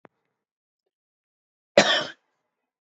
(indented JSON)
{
  "cough_length": "2.8 s",
  "cough_amplitude": 27269,
  "cough_signal_mean_std_ratio": 0.21,
  "survey_phase": "beta (2021-08-13 to 2022-03-07)",
  "age": "45-64",
  "gender": "Male",
  "wearing_mask": "No",
  "symptom_cough_any": true,
  "symptom_runny_or_blocked_nose": true,
  "symptom_sore_throat": true,
  "symptom_fatigue": true,
  "symptom_headache": true,
  "smoker_status": "Ex-smoker",
  "respiratory_condition_asthma": false,
  "respiratory_condition_other": false,
  "recruitment_source": "Test and Trace",
  "submission_delay": "2 days",
  "covid_test_result": "Positive",
  "covid_test_method": "LFT"
}